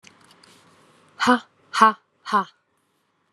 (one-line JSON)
{"exhalation_length": "3.3 s", "exhalation_amplitude": 28519, "exhalation_signal_mean_std_ratio": 0.28, "survey_phase": "alpha (2021-03-01 to 2021-08-12)", "age": "18-44", "gender": "Female", "wearing_mask": "No", "symptom_cough_any": true, "symptom_new_continuous_cough": true, "symptom_shortness_of_breath": true, "symptom_fatigue": true, "symptom_headache": true, "smoker_status": "Ex-smoker", "respiratory_condition_asthma": true, "respiratory_condition_other": false, "recruitment_source": "Test and Trace", "submission_delay": "2 days", "covid_test_result": "Positive", "covid_test_method": "RT-qPCR", "covid_ct_value": 14.4, "covid_ct_gene": "ORF1ab gene", "covid_ct_mean": 14.8, "covid_viral_load": "14000000 copies/ml", "covid_viral_load_category": "High viral load (>1M copies/ml)"}